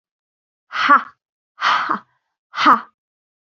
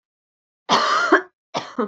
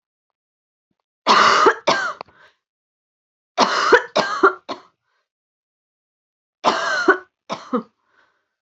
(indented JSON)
{
  "exhalation_length": "3.6 s",
  "exhalation_amplitude": 27835,
  "exhalation_signal_mean_std_ratio": 0.36,
  "cough_length": "1.9 s",
  "cough_amplitude": 25538,
  "cough_signal_mean_std_ratio": 0.49,
  "three_cough_length": "8.6 s",
  "three_cough_amplitude": 32552,
  "three_cough_signal_mean_std_ratio": 0.38,
  "survey_phase": "beta (2021-08-13 to 2022-03-07)",
  "age": "18-44",
  "gender": "Female",
  "wearing_mask": "No",
  "symptom_runny_or_blocked_nose": true,
  "symptom_headache": true,
  "symptom_change_to_sense_of_smell_or_taste": true,
  "symptom_other": true,
  "smoker_status": "Never smoked",
  "respiratory_condition_asthma": false,
  "respiratory_condition_other": false,
  "recruitment_source": "Test and Trace",
  "submission_delay": "2 days",
  "covid_test_result": "Positive",
  "covid_test_method": "RT-qPCR",
  "covid_ct_value": 19.4,
  "covid_ct_gene": "ORF1ab gene"
}